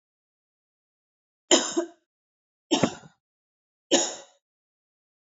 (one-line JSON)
{"three_cough_length": "5.4 s", "three_cough_amplitude": 24865, "three_cough_signal_mean_std_ratio": 0.26, "survey_phase": "alpha (2021-03-01 to 2021-08-12)", "age": "18-44", "gender": "Female", "wearing_mask": "No", "symptom_cough_any": true, "symptom_fatigue": true, "symptom_change_to_sense_of_smell_or_taste": true, "symptom_loss_of_taste": true, "symptom_onset": "6 days", "smoker_status": "Never smoked", "respiratory_condition_asthma": false, "respiratory_condition_other": false, "recruitment_source": "Test and Trace", "submission_delay": "1 day", "covid_test_result": "Positive", "covid_test_method": "RT-qPCR", "covid_ct_value": 20.3, "covid_ct_gene": "N gene", "covid_ct_mean": 20.7, "covid_viral_load": "160000 copies/ml", "covid_viral_load_category": "Low viral load (10K-1M copies/ml)"}